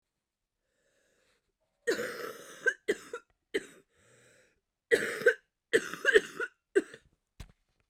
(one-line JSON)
{"cough_length": "7.9 s", "cough_amplitude": 12900, "cough_signal_mean_std_ratio": 0.3, "survey_phase": "beta (2021-08-13 to 2022-03-07)", "age": "18-44", "gender": "Female", "wearing_mask": "No", "symptom_cough_any": true, "symptom_new_continuous_cough": true, "symptom_runny_or_blocked_nose": true, "symptom_headache": true, "symptom_onset": "5 days", "smoker_status": "Never smoked", "respiratory_condition_asthma": false, "respiratory_condition_other": false, "recruitment_source": "REACT", "submission_delay": "2 days", "covid_test_result": "Negative", "covid_test_method": "RT-qPCR", "influenza_a_test_result": "Unknown/Void", "influenza_b_test_result": "Unknown/Void"}